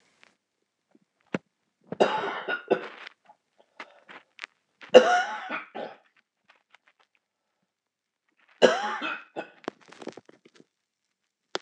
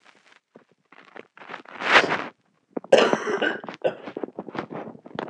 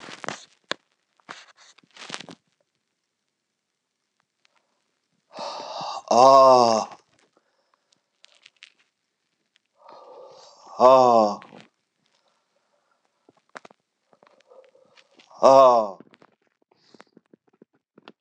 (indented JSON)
{
  "three_cough_length": "11.6 s",
  "three_cough_amplitude": 26028,
  "three_cough_signal_mean_std_ratio": 0.24,
  "cough_length": "5.3 s",
  "cough_amplitude": 26028,
  "cough_signal_mean_std_ratio": 0.38,
  "exhalation_length": "18.2 s",
  "exhalation_amplitude": 26028,
  "exhalation_signal_mean_std_ratio": 0.25,
  "survey_phase": "beta (2021-08-13 to 2022-03-07)",
  "age": "65+",
  "gender": "Male",
  "wearing_mask": "Yes",
  "symptom_cough_any": true,
  "symptom_runny_or_blocked_nose": true,
  "symptom_sore_throat": true,
  "symptom_abdominal_pain": true,
  "symptom_fatigue": true,
  "symptom_fever_high_temperature": true,
  "symptom_headache": true,
  "symptom_onset": "2 days",
  "smoker_status": "Ex-smoker",
  "respiratory_condition_asthma": false,
  "respiratory_condition_other": false,
  "recruitment_source": "Test and Trace",
  "submission_delay": "1 day",
  "covid_test_result": "Positive",
  "covid_test_method": "RT-qPCR",
  "covid_ct_value": 16.9,
  "covid_ct_gene": "N gene"
}